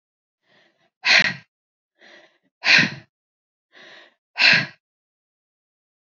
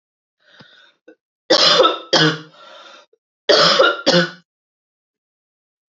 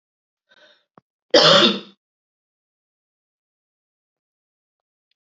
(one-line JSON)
{"exhalation_length": "6.1 s", "exhalation_amplitude": 30519, "exhalation_signal_mean_std_ratio": 0.28, "three_cough_length": "5.9 s", "three_cough_amplitude": 31460, "three_cough_signal_mean_std_ratio": 0.41, "cough_length": "5.2 s", "cough_amplitude": 29435, "cough_signal_mean_std_ratio": 0.23, "survey_phase": "alpha (2021-03-01 to 2021-08-12)", "age": "45-64", "gender": "Female", "wearing_mask": "No", "symptom_cough_any": true, "symptom_headache": true, "smoker_status": "Never smoked", "respiratory_condition_asthma": false, "respiratory_condition_other": false, "recruitment_source": "Test and Trace", "submission_delay": "2 days", "covid_test_result": "Positive", "covid_test_method": "RT-qPCR", "covid_ct_value": 24.3, "covid_ct_gene": "ORF1ab gene", "covid_ct_mean": 25.1, "covid_viral_load": "5800 copies/ml", "covid_viral_load_category": "Minimal viral load (< 10K copies/ml)"}